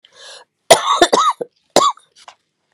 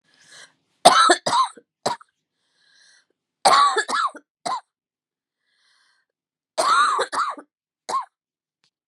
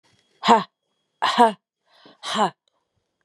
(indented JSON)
{
  "cough_length": "2.7 s",
  "cough_amplitude": 32768,
  "cough_signal_mean_std_ratio": 0.4,
  "three_cough_length": "8.9 s",
  "three_cough_amplitude": 32768,
  "three_cough_signal_mean_std_ratio": 0.38,
  "exhalation_length": "3.2 s",
  "exhalation_amplitude": 31160,
  "exhalation_signal_mean_std_ratio": 0.33,
  "survey_phase": "beta (2021-08-13 to 2022-03-07)",
  "age": "45-64",
  "gender": "Female",
  "wearing_mask": "No",
  "symptom_cough_any": true,
  "symptom_new_continuous_cough": true,
  "symptom_runny_or_blocked_nose": true,
  "symptom_shortness_of_breath": true,
  "symptom_sore_throat": true,
  "symptom_diarrhoea": true,
  "symptom_fatigue": true,
  "symptom_fever_high_temperature": true,
  "symptom_headache": true,
  "symptom_onset": "3 days",
  "smoker_status": "Never smoked",
  "respiratory_condition_asthma": false,
  "respiratory_condition_other": false,
  "recruitment_source": "Test and Trace",
  "submission_delay": "2 days",
  "covid_test_result": "Positive",
  "covid_test_method": "ePCR"
}